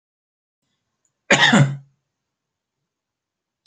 {"cough_length": "3.7 s", "cough_amplitude": 32767, "cough_signal_mean_std_ratio": 0.27, "survey_phase": "alpha (2021-03-01 to 2021-08-12)", "age": "45-64", "gender": "Male", "wearing_mask": "No", "symptom_none": true, "smoker_status": "Never smoked", "respiratory_condition_asthma": true, "respiratory_condition_other": false, "recruitment_source": "REACT", "submission_delay": "2 days", "covid_test_result": "Negative", "covid_test_method": "RT-qPCR"}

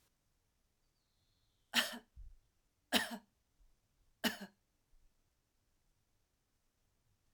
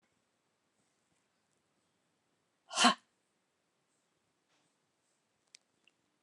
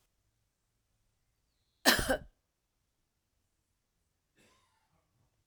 {"three_cough_length": "7.3 s", "three_cough_amplitude": 5343, "three_cough_signal_mean_std_ratio": 0.22, "exhalation_length": "6.2 s", "exhalation_amplitude": 8902, "exhalation_signal_mean_std_ratio": 0.14, "cough_length": "5.5 s", "cough_amplitude": 12504, "cough_signal_mean_std_ratio": 0.17, "survey_phase": "alpha (2021-03-01 to 2021-08-12)", "age": "65+", "gender": "Female", "wearing_mask": "No", "symptom_none": true, "smoker_status": "Ex-smoker", "respiratory_condition_asthma": false, "respiratory_condition_other": false, "recruitment_source": "REACT", "submission_delay": "2 days", "covid_test_result": "Negative", "covid_test_method": "RT-qPCR"}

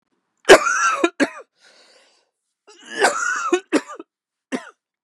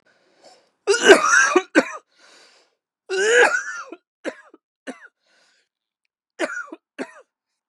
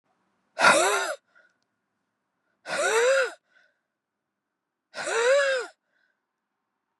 {"three_cough_length": "5.0 s", "three_cough_amplitude": 32768, "three_cough_signal_mean_std_ratio": 0.36, "cough_length": "7.7 s", "cough_amplitude": 32768, "cough_signal_mean_std_ratio": 0.35, "exhalation_length": "7.0 s", "exhalation_amplitude": 19704, "exhalation_signal_mean_std_ratio": 0.42, "survey_phase": "beta (2021-08-13 to 2022-03-07)", "age": "18-44", "gender": "Male", "wearing_mask": "Yes", "symptom_cough_any": true, "symptom_fatigue": true, "symptom_headache": true, "symptom_change_to_sense_of_smell_or_taste": true, "symptom_onset": "2 days", "smoker_status": "Never smoked", "respiratory_condition_asthma": false, "respiratory_condition_other": true, "recruitment_source": "Test and Trace", "submission_delay": "1 day", "covid_test_result": "Positive", "covid_test_method": "ePCR"}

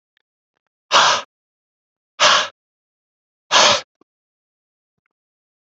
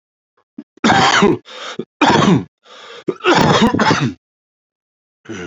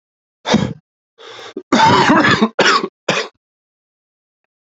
{"exhalation_length": "5.6 s", "exhalation_amplitude": 30356, "exhalation_signal_mean_std_ratio": 0.3, "three_cough_length": "5.5 s", "three_cough_amplitude": 30302, "three_cough_signal_mean_std_ratio": 0.53, "cough_length": "4.6 s", "cough_amplitude": 32767, "cough_signal_mean_std_ratio": 0.47, "survey_phase": "beta (2021-08-13 to 2022-03-07)", "age": "18-44", "gender": "Male", "wearing_mask": "No", "symptom_runny_or_blocked_nose": true, "symptom_fever_high_temperature": true, "symptom_change_to_sense_of_smell_or_taste": true, "symptom_other": true, "symptom_onset": "3 days", "smoker_status": "Current smoker (11 or more cigarettes per day)", "respiratory_condition_asthma": false, "respiratory_condition_other": false, "recruitment_source": "Test and Trace", "submission_delay": "2 days", "covid_test_result": "Positive", "covid_test_method": "RT-qPCR", "covid_ct_value": 13.0, "covid_ct_gene": "S gene", "covid_ct_mean": 13.7, "covid_viral_load": "33000000 copies/ml", "covid_viral_load_category": "High viral load (>1M copies/ml)"}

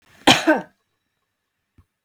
{"cough_length": "2.0 s", "cough_amplitude": 32768, "cough_signal_mean_std_ratio": 0.27, "survey_phase": "beta (2021-08-13 to 2022-03-07)", "age": "45-64", "gender": "Female", "wearing_mask": "No", "symptom_none": true, "smoker_status": "Never smoked", "respiratory_condition_asthma": false, "respiratory_condition_other": false, "recruitment_source": "REACT", "submission_delay": "1 day", "covid_test_result": "Negative", "covid_test_method": "RT-qPCR"}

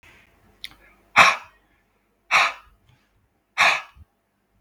{"exhalation_length": "4.6 s", "exhalation_amplitude": 32766, "exhalation_signal_mean_std_ratio": 0.29, "survey_phase": "beta (2021-08-13 to 2022-03-07)", "age": "18-44", "gender": "Male", "wearing_mask": "No", "symptom_none": true, "smoker_status": "Ex-smoker", "respiratory_condition_asthma": false, "respiratory_condition_other": false, "recruitment_source": "REACT", "submission_delay": "4 days", "covid_test_result": "Negative", "covid_test_method": "RT-qPCR"}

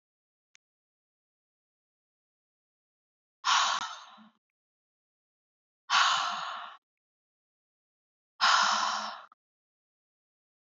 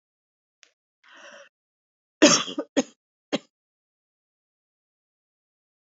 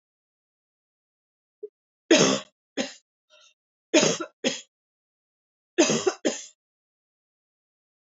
{"exhalation_length": "10.7 s", "exhalation_amplitude": 11019, "exhalation_signal_mean_std_ratio": 0.32, "cough_length": "5.9 s", "cough_amplitude": 28340, "cough_signal_mean_std_ratio": 0.18, "three_cough_length": "8.2 s", "three_cough_amplitude": 18120, "three_cough_signal_mean_std_ratio": 0.28, "survey_phase": "alpha (2021-03-01 to 2021-08-12)", "age": "45-64", "gender": "Female", "wearing_mask": "No", "symptom_none": true, "smoker_status": "Never smoked", "respiratory_condition_asthma": false, "respiratory_condition_other": false, "recruitment_source": "REACT", "submission_delay": "1 day", "covid_test_result": "Negative", "covid_test_method": "RT-qPCR"}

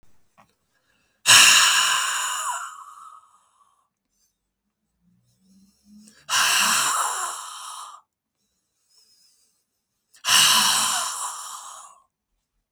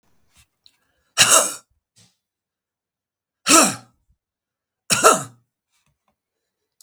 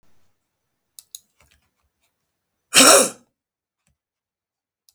{"exhalation_length": "12.7 s", "exhalation_amplitude": 32768, "exhalation_signal_mean_std_ratio": 0.41, "three_cough_length": "6.8 s", "three_cough_amplitude": 32768, "three_cough_signal_mean_std_ratio": 0.27, "cough_length": "4.9 s", "cough_amplitude": 32768, "cough_signal_mean_std_ratio": 0.21, "survey_phase": "beta (2021-08-13 to 2022-03-07)", "age": "65+", "gender": "Male", "wearing_mask": "No", "symptom_cough_any": true, "symptom_shortness_of_breath": true, "symptom_sore_throat": true, "symptom_onset": "12 days", "smoker_status": "Ex-smoker", "respiratory_condition_asthma": true, "respiratory_condition_other": true, "recruitment_source": "REACT", "submission_delay": "16 days", "covid_test_result": "Negative", "covid_test_method": "RT-qPCR", "influenza_a_test_result": "Negative", "influenza_b_test_result": "Negative"}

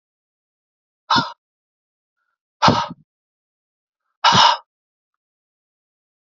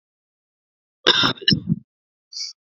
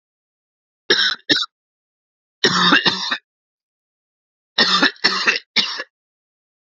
{"exhalation_length": "6.2 s", "exhalation_amplitude": 28420, "exhalation_signal_mean_std_ratio": 0.26, "cough_length": "2.7 s", "cough_amplitude": 29716, "cough_signal_mean_std_ratio": 0.33, "three_cough_length": "6.7 s", "three_cough_amplitude": 32768, "three_cough_signal_mean_std_ratio": 0.41, "survey_phase": "beta (2021-08-13 to 2022-03-07)", "age": "18-44", "gender": "Male", "wearing_mask": "No", "symptom_cough_any": true, "symptom_runny_or_blocked_nose": true, "symptom_fatigue": true, "symptom_change_to_sense_of_smell_or_taste": true, "symptom_other": true, "symptom_onset": "4 days", "smoker_status": "Never smoked", "respiratory_condition_asthma": false, "respiratory_condition_other": false, "recruitment_source": "Test and Trace", "submission_delay": "2 days", "covid_test_result": "Positive", "covid_test_method": "RT-qPCR", "covid_ct_value": 19.0, "covid_ct_gene": "ORF1ab gene", "covid_ct_mean": 19.3, "covid_viral_load": "480000 copies/ml", "covid_viral_load_category": "Low viral load (10K-1M copies/ml)"}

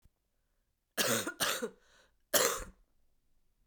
{"three_cough_length": "3.7 s", "three_cough_amplitude": 8989, "three_cough_signal_mean_std_ratio": 0.39, "survey_phase": "beta (2021-08-13 to 2022-03-07)", "age": "18-44", "gender": "Female", "wearing_mask": "No", "symptom_cough_any": true, "symptom_new_continuous_cough": true, "symptom_runny_or_blocked_nose": true, "symptom_fatigue": true, "symptom_headache": true, "symptom_onset": "6 days", "smoker_status": "Never smoked", "respiratory_condition_asthma": true, "respiratory_condition_other": false, "recruitment_source": "REACT", "submission_delay": "1 day", "covid_test_result": "Negative", "covid_test_method": "RT-qPCR", "influenza_a_test_result": "Negative", "influenza_b_test_result": "Negative"}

